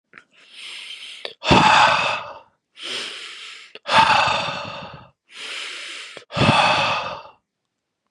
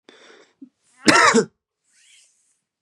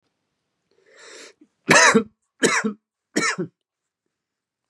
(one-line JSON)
{"exhalation_length": "8.1 s", "exhalation_amplitude": 32511, "exhalation_signal_mean_std_ratio": 0.5, "cough_length": "2.8 s", "cough_amplitude": 32767, "cough_signal_mean_std_ratio": 0.3, "three_cough_length": "4.7 s", "three_cough_amplitude": 29130, "three_cough_signal_mean_std_ratio": 0.32, "survey_phase": "beta (2021-08-13 to 2022-03-07)", "age": "18-44", "gender": "Male", "wearing_mask": "No", "symptom_cough_any": true, "symptom_runny_or_blocked_nose": true, "symptom_fatigue": true, "symptom_change_to_sense_of_smell_or_taste": true, "symptom_onset": "4 days", "smoker_status": "Ex-smoker", "respiratory_condition_asthma": false, "respiratory_condition_other": false, "recruitment_source": "Test and Trace", "submission_delay": "1 day", "covid_test_result": "Positive", "covid_test_method": "RT-qPCR", "covid_ct_value": 12.8, "covid_ct_gene": "N gene"}